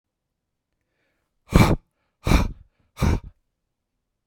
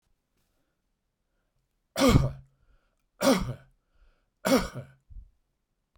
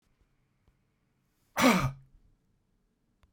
{
  "exhalation_length": "4.3 s",
  "exhalation_amplitude": 32767,
  "exhalation_signal_mean_std_ratio": 0.29,
  "three_cough_length": "6.0 s",
  "three_cough_amplitude": 20154,
  "three_cough_signal_mean_std_ratio": 0.3,
  "cough_length": "3.3 s",
  "cough_amplitude": 10420,
  "cough_signal_mean_std_ratio": 0.26,
  "survey_phase": "beta (2021-08-13 to 2022-03-07)",
  "age": "45-64",
  "gender": "Male",
  "wearing_mask": "No",
  "symptom_none": true,
  "smoker_status": "Ex-smoker",
  "recruitment_source": "REACT",
  "submission_delay": "2 days",
  "covid_test_result": "Negative",
  "covid_test_method": "RT-qPCR",
  "influenza_a_test_result": "Negative",
  "influenza_b_test_result": "Negative"
}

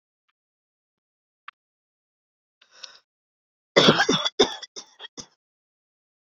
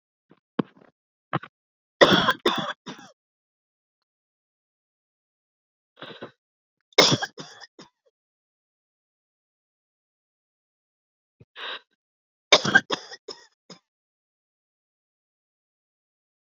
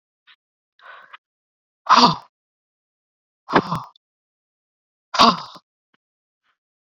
{
  "cough_length": "6.2 s",
  "cough_amplitude": 32767,
  "cough_signal_mean_std_ratio": 0.23,
  "three_cough_length": "16.6 s",
  "three_cough_amplitude": 29706,
  "three_cough_signal_mean_std_ratio": 0.19,
  "exhalation_length": "7.0 s",
  "exhalation_amplitude": 28843,
  "exhalation_signal_mean_std_ratio": 0.23,
  "survey_phase": "beta (2021-08-13 to 2022-03-07)",
  "age": "45-64",
  "gender": "Female",
  "wearing_mask": "No",
  "symptom_none": true,
  "smoker_status": "Never smoked",
  "respiratory_condition_asthma": false,
  "respiratory_condition_other": false,
  "recruitment_source": "REACT",
  "submission_delay": "2 days",
  "covid_test_result": "Negative",
  "covid_test_method": "RT-qPCR",
  "influenza_a_test_result": "Negative",
  "influenza_b_test_result": "Negative"
}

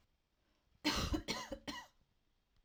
{
  "cough_length": "2.6 s",
  "cough_amplitude": 2421,
  "cough_signal_mean_std_ratio": 0.42,
  "survey_phase": "alpha (2021-03-01 to 2021-08-12)",
  "age": "18-44",
  "gender": "Female",
  "wearing_mask": "No",
  "symptom_none": true,
  "smoker_status": "Never smoked",
  "respiratory_condition_asthma": false,
  "respiratory_condition_other": false,
  "recruitment_source": "REACT",
  "submission_delay": "1 day",
  "covid_test_result": "Negative",
  "covid_test_method": "RT-qPCR"
}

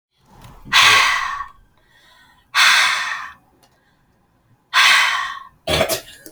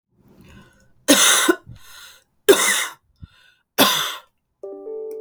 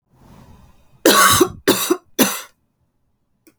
{
  "exhalation_length": "6.3 s",
  "exhalation_amplitude": 32767,
  "exhalation_signal_mean_std_ratio": 0.49,
  "three_cough_length": "5.2 s",
  "three_cough_amplitude": 32767,
  "three_cough_signal_mean_std_ratio": 0.41,
  "cough_length": "3.6 s",
  "cough_amplitude": 32768,
  "cough_signal_mean_std_ratio": 0.39,
  "survey_phase": "alpha (2021-03-01 to 2021-08-12)",
  "age": "18-44",
  "gender": "Female",
  "wearing_mask": "No",
  "symptom_cough_any": true,
  "symptom_fatigue": true,
  "symptom_headache": true,
  "smoker_status": "Current smoker (1 to 10 cigarettes per day)",
  "respiratory_condition_asthma": false,
  "respiratory_condition_other": false,
  "recruitment_source": "Test and Trace",
  "submission_delay": "2 days",
  "covid_test_result": "Positive",
  "covid_test_method": "RT-qPCR",
  "covid_ct_value": 22.8,
  "covid_ct_gene": "ORF1ab gene",
  "covid_ct_mean": 24.5,
  "covid_viral_load": "9100 copies/ml",
  "covid_viral_load_category": "Minimal viral load (< 10K copies/ml)"
}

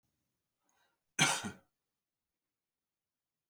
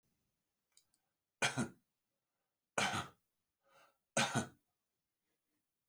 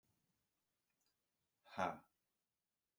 {
  "cough_length": "3.5 s",
  "cough_amplitude": 5628,
  "cough_signal_mean_std_ratio": 0.21,
  "three_cough_length": "5.9 s",
  "three_cough_amplitude": 4096,
  "three_cough_signal_mean_std_ratio": 0.28,
  "exhalation_length": "3.0 s",
  "exhalation_amplitude": 1589,
  "exhalation_signal_mean_std_ratio": 0.2,
  "survey_phase": "beta (2021-08-13 to 2022-03-07)",
  "age": "45-64",
  "gender": "Male",
  "wearing_mask": "No",
  "symptom_cough_any": true,
  "symptom_sore_throat": true,
  "symptom_fatigue": true,
  "symptom_onset": "9 days",
  "smoker_status": "Ex-smoker",
  "respiratory_condition_asthma": false,
  "respiratory_condition_other": false,
  "recruitment_source": "REACT",
  "submission_delay": "1 day",
  "covid_test_result": "Negative",
  "covid_test_method": "RT-qPCR"
}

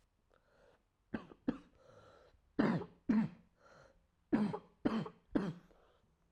{
  "three_cough_length": "6.3 s",
  "three_cough_amplitude": 3466,
  "three_cough_signal_mean_std_ratio": 0.37,
  "survey_phase": "alpha (2021-03-01 to 2021-08-12)",
  "age": "18-44",
  "gender": "Female",
  "wearing_mask": "No",
  "symptom_cough_any": true,
  "symptom_shortness_of_breath": true,
  "symptom_diarrhoea": true,
  "symptom_fatigue": true,
  "symptom_fever_high_temperature": true,
  "symptom_headache": true,
  "symptom_onset": "4 days",
  "smoker_status": "Never smoked",
  "respiratory_condition_asthma": true,
  "respiratory_condition_other": false,
  "recruitment_source": "Test and Trace",
  "submission_delay": "2 days",
  "covid_test_result": "Positive",
  "covid_test_method": "RT-qPCR"
}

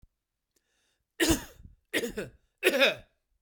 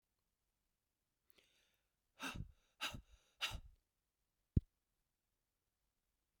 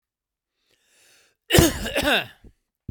{
  "three_cough_length": "3.4 s",
  "three_cough_amplitude": 14212,
  "three_cough_signal_mean_std_ratio": 0.36,
  "exhalation_length": "6.4 s",
  "exhalation_amplitude": 3149,
  "exhalation_signal_mean_std_ratio": 0.19,
  "cough_length": "2.9 s",
  "cough_amplitude": 32767,
  "cough_signal_mean_std_ratio": 0.35,
  "survey_phase": "beta (2021-08-13 to 2022-03-07)",
  "age": "45-64",
  "gender": "Male",
  "wearing_mask": "No",
  "symptom_none": true,
  "smoker_status": "Never smoked",
  "respiratory_condition_asthma": false,
  "respiratory_condition_other": false,
  "recruitment_source": "REACT",
  "submission_delay": "13 days",
  "covid_test_result": "Negative",
  "covid_test_method": "RT-qPCR",
  "influenza_a_test_result": "Negative",
  "influenza_b_test_result": "Negative"
}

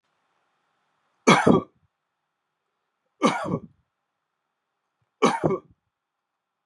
{
  "three_cough_length": "6.7 s",
  "three_cough_amplitude": 27469,
  "three_cough_signal_mean_std_ratio": 0.27,
  "survey_phase": "beta (2021-08-13 to 2022-03-07)",
  "age": "45-64",
  "gender": "Male",
  "wearing_mask": "No",
  "symptom_none": true,
  "smoker_status": "Never smoked",
  "respiratory_condition_asthma": false,
  "respiratory_condition_other": false,
  "recruitment_source": "REACT",
  "submission_delay": "1 day",
  "covid_test_result": "Negative",
  "covid_test_method": "RT-qPCR",
  "influenza_a_test_result": "Negative",
  "influenza_b_test_result": "Negative"
}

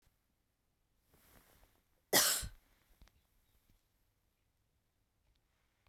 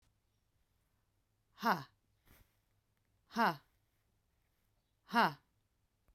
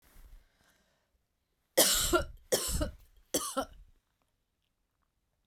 {
  "cough_length": "5.9 s",
  "cough_amplitude": 6525,
  "cough_signal_mean_std_ratio": 0.19,
  "exhalation_length": "6.1 s",
  "exhalation_amplitude": 4456,
  "exhalation_signal_mean_std_ratio": 0.23,
  "three_cough_length": "5.5 s",
  "three_cough_amplitude": 12608,
  "three_cough_signal_mean_std_ratio": 0.35,
  "survey_phase": "beta (2021-08-13 to 2022-03-07)",
  "age": "45-64",
  "gender": "Female",
  "wearing_mask": "No",
  "symptom_headache": true,
  "symptom_onset": "12 days",
  "smoker_status": "Never smoked",
  "respiratory_condition_asthma": false,
  "respiratory_condition_other": false,
  "recruitment_source": "REACT",
  "submission_delay": "1 day",
  "covid_test_result": "Negative",
  "covid_test_method": "RT-qPCR"
}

